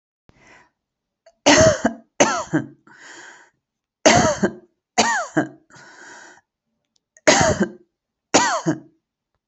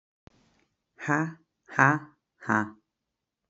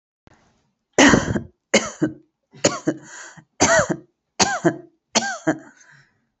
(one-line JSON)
{"three_cough_length": "9.5 s", "three_cough_amplitude": 29593, "three_cough_signal_mean_std_ratio": 0.39, "exhalation_length": "3.5 s", "exhalation_amplitude": 20768, "exhalation_signal_mean_std_ratio": 0.3, "cough_length": "6.4 s", "cough_amplitude": 32767, "cough_signal_mean_std_ratio": 0.39, "survey_phase": "beta (2021-08-13 to 2022-03-07)", "age": "18-44", "gender": "Female", "wearing_mask": "No", "symptom_runny_or_blocked_nose": true, "smoker_status": "Current smoker (1 to 10 cigarettes per day)", "respiratory_condition_asthma": false, "respiratory_condition_other": false, "recruitment_source": "REACT", "submission_delay": "1 day", "covid_test_result": "Negative", "covid_test_method": "RT-qPCR", "influenza_a_test_result": "Negative", "influenza_b_test_result": "Negative"}